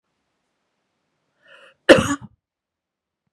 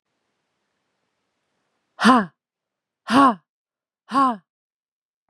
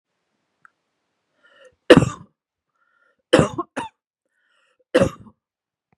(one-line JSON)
{"cough_length": "3.3 s", "cough_amplitude": 32768, "cough_signal_mean_std_ratio": 0.18, "exhalation_length": "5.3 s", "exhalation_amplitude": 32105, "exhalation_signal_mean_std_ratio": 0.28, "three_cough_length": "6.0 s", "three_cough_amplitude": 32768, "three_cough_signal_mean_std_ratio": 0.21, "survey_phase": "beta (2021-08-13 to 2022-03-07)", "age": "18-44", "gender": "Female", "wearing_mask": "No", "symptom_none": true, "symptom_onset": "13 days", "smoker_status": "Never smoked", "respiratory_condition_asthma": false, "respiratory_condition_other": false, "recruitment_source": "REACT", "submission_delay": "2 days", "covid_test_result": "Negative", "covid_test_method": "RT-qPCR", "influenza_a_test_result": "Unknown/Void", "influenza_b_test_result": "Unknown/Void"}